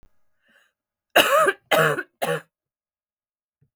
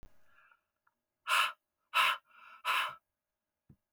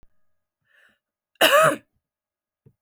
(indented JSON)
{
  "three_cough_length": "3.8 s",
  "three_cough_amplitude": 32768,
  "three_cough_signal_mean_std_ratio": 0.36,
  "exhalation_length": "3.9 s",
  "exhalation_amplitude": 5705,
  "exhalation_signal_mean_std_ratio": 0.36,
  "cough_length": "2.8 s",
  "cough_amplitude": 27872,
  "cough_signal_mean_std_ratio": 0.28,
  "survey_phase": "beta (2021-08-13 to 2022-03-07)",
  "age": "45-64",
  "gender": "Female",
  "wearing_mask": "No",
  "symptom_cough_any": true,
  "symptom_new_continuous_cough": true,
  "symptom_runny_or_blocked_nose": true,
  "symptom_sore_throat": true,
  "symptom_fatigue": true,
  "symptom_fever_high_temperature": true,
  "symptom_headache": true,
  "symptom_other": true,
  "symptom_onset": "5 days",
  "smoker_status": "Never smoked",
  "respiratory_condition_asthma": false,
  "respiratory_condition_other": false,
  "recruitment_source": "Test and Trace",
  "submission_delay": "2 days",
  "covid_test_result": "Positive",
  "covid_test_method": "RT-qPCR",
  "covid_ct_value": 20.3,
  "covid_ct_gene": "ORF1ab gene"
}